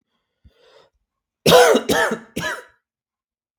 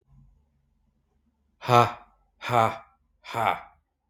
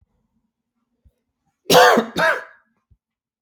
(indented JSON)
{
  "three_cough_length": "3.6 s",
  "three_cough_amplitude": 32768,
  "three_cough_signal_mean_std_ratio": 0.35,
  "exhalation_length": "4.1 s",
  "exhalation_amplitude": 24818,
  "exhalation_signal_mean_std_ratio": 0.29,
  "cough_length": "3.4 s",
  "cough_amplitude": 32768,
  "cough_signal_mean_std_ratio": 0.32,
  "survey_phase": "beta (2021-08-13 to 2022-03-07)",
  "age": "45-64",
  "gender": "Male",
  "wearing_mask": "No",
  "symptom_cough_any": true,
  "symptom_runny_or_blocked_nose": true,
  "symptom_sore_throat": true,
  "symptom_fatigue": true,
  "symptom_headache": true,
  "symptom_change_to_sense_of_smell_or_taste": true,
  "symptom_onset": "2 days",
  "smoker_status": "Current smoker (e-cigarettes or vapes only)",
  "respiratory_condition_asthma": false,
  "respiratory_condition_other": false,
  "recruitment_source": "Test and Trace",
  "submission_delay": "2 days",
  "covid_test_result": "Positive",
  "covid_test_method": "RT-qPCR",
  "covid_ct_value": 16.6,
  "covid_ct_gene": "ORF1ab gene",
  "covid_ct_mean": 16.9,
  "covid_viral_load": "2900000 copies/ml",
  "covid_viral_load_category": "High viral load (>1M copies/ml)"
}